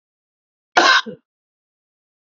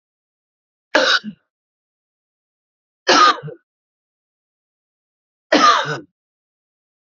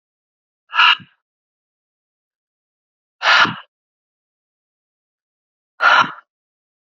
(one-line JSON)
{"cough_length": "2.3 s", "cough_amplitude": 30296, "cough_signal_mean_std_ratio": 0.27, "three_cough_length": "7.1 s", "three_cough_amplitude": 29207, "three_cough_signal_mean_std_ratio": 0.29, "exhalation_length": "7.0 s", "exhalation_amplitude": 30511, "exhalation_signal_mean_std_ratio": 0.26, "survey_phase": "beta (2021-08-13 to 2022-03-07)", "age": "45-64", "gender": "Male", "wearing_mask": "No", "symptom_sore_throat": true, "symptom_onset": "12 days", "smoker_status": "Never smoked", "respiratory_condition_asthma": false, "respiratory_condition_other": false, "recruitment_source": "REACT", "submission_delay": "3 days", "covid_test_result": "Negative", "covid_test_method": "RT-qPCR"}